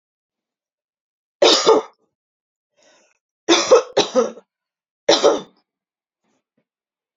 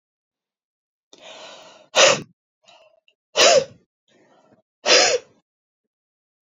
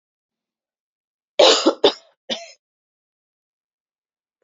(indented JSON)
{
  "three_cough_length": "7.2 s",
  "three_cough_amplitude": 32767,
  "three_cough_signal_mean_std_ratio": 0.32,
  "exhalation_length": "6.6 s",
  "exhalation_amplitude": 30896,
  "exhalation_signal_mean_std_ratio": 0.29,
  "cough_length": "4.4 s",
  "cough_amplitude": 28794,
  "cough_signal_mean_std_ratio": 0.24,
  "survey_phase": "beta (2021-08-13 to 2022-03-07)",
  "age": "45-64",
  "gender": "Female",
  "wearing_mask": "No",
  "symptom_none": true,
  "smoker_status": "Ex-smoker",
  "respiratory_condition_asthma": false,
  "respiratory_condition_other": false,
  "recruitment_source": "REACT",
  "submission_delay": "3 days",
  "covid_test_result": "Negative",
  "covid_test_method": "RT-qPCR"
}